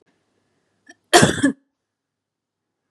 {"cough_length": "2.9 s", "cough_amplitude": 32767, "cough_signal_mean_std_ratio": 0.25, "survey_phase": "beta (2021-08-13 to 2022-03-07)", "age": "18-44", "gender": "Female", "wearing_mask": "No", "symptom_fatigue": true, "symptom_headache": true, "smoker_status": "Never smoked", "respiratory_condition_asthma": false, "respiratory_condition_other": false, "recruitment_source": "REACT", "submission_delay": "1 day", "covid_test_result": "Negative", "covid_test_method": "RT-qPCR", "influenza_a_test_result": "Negative", "influenza_b_test_result": "Negative"}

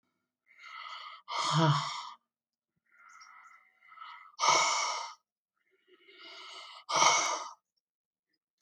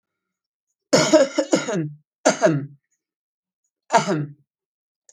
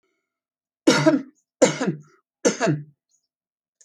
{"exhalation_length": "8.6 s", "exhalation_amplitude": 10197, "exhalation_signal_mean_std_ratio": 0.41, "cough_length": "5.1 s", "cough_amplitude": 27423, "cough_signal_mean_std_ratio": 0.39, "three_cough_length": "3.8 s", "three_cough_amplitude": 27291, "three_cough_signal_mean_std_ratio": 0.36, "survey_phase": "alpha (2021-03-01 to 2021-08-12)", "age": "65+", "gender": "Female", "wearing_mask": "No", "symptom_none": true, "smoker_status": "Never smoked", "respiratory_condition_asthma": false, "respiratory_condition_other": false, "recruitment_source": "REACT", "submission_delay": "2 days", "covid_test_result": "Negative", "covid_test_method": "RT-qPCR"}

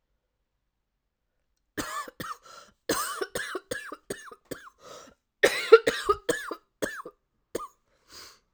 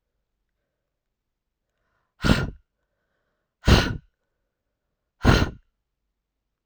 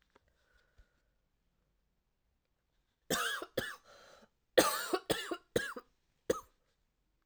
{"cough_length": "8.5 s", "cough_amplitude": 29961, "cough_signal_mean_std_ratio": 0.27, "exhalation_length": "6.7 s", "exhalation_amplitude": 24499, "exhalation_signal_mean_std_ratio": 0.24, "three_cough_length": "7.3 s", "three_cough_amplitude": 9363, "three_cough_signal_mean_std_ratio": 0.29, "survey_phase": "alpha (2021-03-01 to 2021-08-12)", "age": "18-44", "gender": "Female", "wearing_mask": "No", "symptom_cough_any": true, "symptom_new_continuous_cough": true, "symptom_fatigue": true, "symptom_onset": "2 days", "smoker_status": "Never smoked", "respiratory_condition_asthma": true, "respiratory_condition_other": false, "recruitment_source": "Test and Trace", "submission_delay": "1 day", "covid_test_result": "Positive", "covid_test_method": "RT-qPCR"}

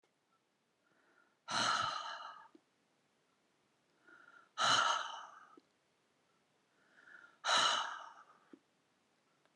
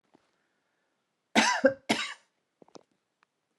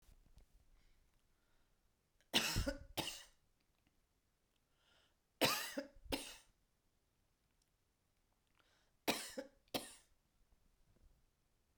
{"exhalation_length": "9.6 s", "exhalation_amplitude": 3728, "exhalation_signal_mean_std_ratio": 0.36, "cough_length": "3.6 s", "cough_amplitude": 13313, "cough_signal_mean_std_ratio": 0.28, "three_cough_length": "11.8 s", "three_cough_amplitude": 3484, "three_cough_signal_mean_std_ratio": 0.28, "survey_phase": "beta (2021-08-13 to 2022-03-07)", "age": "45-64", "gender": "Female", "wearing_mask": "No", "symptom_none": true, "smoker_status": "Never smoked", "respiratory_condition_asthma": false, "respiratory_condition_other": false, "recruitment_source": "REACT", "submission_delay": "3 days", "covid_test_result": "Negative", "covid_test_method": "RT-qPCR"}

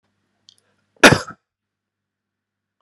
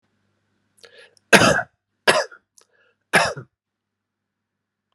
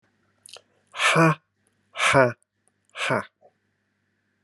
{"cough_length": "2.8 s", "cough_amplitude": 32768, "cough_signal_mean_std_ratio": 0.17, "three_cough_length": "4.9 s", "three_cough_amplitude": 32768, "three_cough_signal_mean_std_ratio": 0.27, "exhalation_length": "4.4 s", "exhalation_amplitude": 24789, "exhalation_signal_mean_std_ratio": 0.34, "survey_phase": "alpha (2021-03-01 to 2021-08-12)", "age": "45-64", "gender": "Male", "wearing_mask": "No", "symptom_none": true, "smoker_status": "Never smoked", "respiratory_condition_asthma": false, "respiratory_condition_other": false, "recruitment_source": "REACT", "submission_delay": "1 day", "covid_test_result": "Negative", "covid_test_method": "RT-qPCR"}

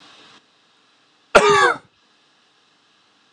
{"cough_length": "3.3 s", "cough_amplitude": 32768, "cough_signal_mean_std_ratio": 0.28, "survey_phase": "alpha (2021-03-01 to 2021-08-12)", "age": "18-44", "gender": "Male", "wearing_mask": "No", "symptom_cough_any": true, "symptom_fatigue": true, "symptom_change_to_sense_of_smell_or_taste": true, "symptom_loss_of_taste": true, "symptom_onset": "3 days", "smoker_status": "Never smoked", "respiratory_condition_asthma": false, "respiratory_condition_other": false, "recruitment_source": "Test and Trace", "submission_delay": "1 day", "covid_test_result": "Positive", "covid_test_method": "RT-qPCR", "covid_ct_value": 22.8, "covid_ct_gene": "ORF1ab gene"}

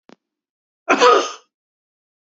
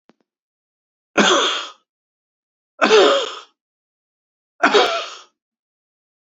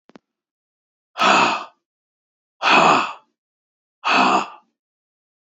{"cough_length": "2.3 s", "cough_amplitude": 32182, "cough_signal_mean_std_ratio": 0.31, "three_cough_length": "6.4 s", "three_cough_amplitude": 28204, "three_cough_signal_mean_std_ratio": 0.36, "exhalation_length": "5.5 s", "exhalation_amplitude": 27006, "exhalation_signal_mean_std_ratio": 0.4, "survey_phase": "beta (2021-08-13 to 2022-03-07)", "age": "45-64", "gender": "Male", "wearing_mask": "No", "symptom_cough_any": true, "symptom_runny_or_blocked_nose": true, "symptom_sore_throat": true, "symptom_fatigue": true, "symptom_headache": true, "symptom_onset": "4 days", "smoker_status": "Never smoked", "respiratory_condition_asthma": false, "respiratory_condition_other": false, "recruitment_source": "Test and Trace", "submission_delay": "2 days", "covid_test_result": "Positive", "covid_test_method": "RT-qPCR", "covid_ct_value": 19.0, "covid_ct_gene": "ORF1ab gene"}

